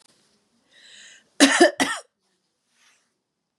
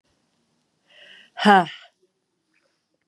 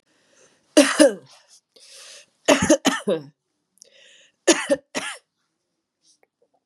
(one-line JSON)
{"cough_length": "3.6 s", "cough_amplitude": 30978, "cough_signal_mean_std_ratio": 0.26, "exhalation_length": "3.1 s", "exhalation_amplitude": 30595, "exhalation_signal_mean_std_ratio": 0.22, "three_cough_length": "6.7 s", "three_cough_amplitude": 32767, "three_cough_signal_mean_std_ratio": 0.31, "survey_phase": "beta (2021-08-13 to 2022-03-07)", "age": "45-64", "gender": "Female", "wearing_mask": "No", "symptom_runny_or_blocked_nose": true, "symptom_sore_throat": true, "symptom_headache": true, "symptom_change_to_sense_of_smell_or_taste": true, "smoker_status": "Ex-smoker", "respiratory_condition_asthma": false, "respiratory_condition_other": false, "recruitment_source": "Test and Trace", "submission_delay": "1 day", "covid_test_result": "Positive", "covid_test_method": "LFT"}